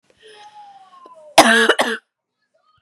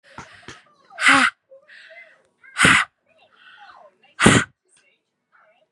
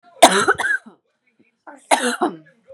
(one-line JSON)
{"cough_length": "2.8 s", "cough_amplitude": 32768, "cough_signal_mean_std_ratio": 0.34, "exhalation_length": "5.7 s", "exhalation_amplitude": 32767, "exhalation_signal_mean_std_ratio": 0.31, "three_cough_length": "2.7 s", "three_cough_amplitude": 32768, "three_cough_signal_mean_std_ratio": 0.39, "survey_phase": "beta (2021-08-13 to 2022-03-07)", "age": "18-44", "gender": "Female", "wearing_mask": "No", "symptom_none": true, "smoker_status": "Never smoked", "respiratory_condition_asthma": false, "respiratory_condition_other": false, "recruitment_source": "REACT", "submission_delay": "1 day", "covid_test_result": "Negative", "covid_test_method": "RT-qPCR", "influenza_a_test_result": "Negative", "influenza_b_test_result": "Negative"}